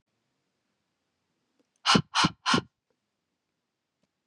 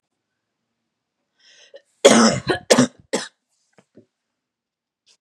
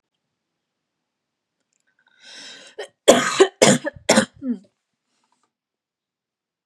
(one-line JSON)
{"exhalation_length": "4.3 s", "exhalation_amplitude": 13798, "exhalation_signal_mean_std_ratio": 0.25, "cough_length": "5.2 s", "cough_amplitude": 32768, "cough_signal_mean_std_ratio": 0.27, "three_cough_length": "6.7 s", "three_cough_amplitude": 32767, "three_cough_signal_mean_std_ratio": 0.26, "survey_phase": "beta (2021-08-13 to 2022-03-07)", "age": "18-44", "gender": "Female", "wearing_mask": "No", "symptom_cough_any": true, "symptom_fatigue": true, "symptom_onset": "12 days", "smoker_status": "Never smoked", "respiratory_condition_asthma": false, "respiratory_condition_other": false, "recruitment_source": "REACT", "submission_delay": "3 days", "covid_test_result": "Negative", "covid_test_method": "RT-qPCR", "influenza_a_test_result": "Negative", "influenza_b_test_result": "Negative"}